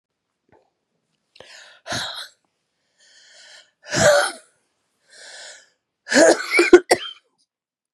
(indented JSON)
{
  "exhalation_length": "7.9 s",
  "exhalation_amplitude": 32768,
  "exhalation_signal_mean_std_ratio": 0.29,
  "survey_phase": "beta (2021-08-13 to 2022-03-07)",
  "age": "45-64",
  "gender": "Female",
  "wearing_mask": "No",
  "symptom_cough_any": true,
  "symptom_new_continuous_cough": true,
  "symptom_runny_or_blocked_nose": true,
  "symptom_shortness_of_breath": true,
  "symptom_fatigue": true,
  "symptom_fever_high_temperature": true,
  "symptom_headache": true,
  "symptom_change_to_sense_of_smell_or_taste": true,
  "symptom_loss_of_taste": true,
  "symptom_onset": "4 days",
  "smoker_status": "Never smoked",
  "respiratory_condition_asthma": false,
  "respiratory_condition_other": false,
  "recruitment_source": "Test and Trace",
  "submission_delay": "1 day",
  "covid_test_result": "Positive",
  "covid_test_method": "ePCR"
}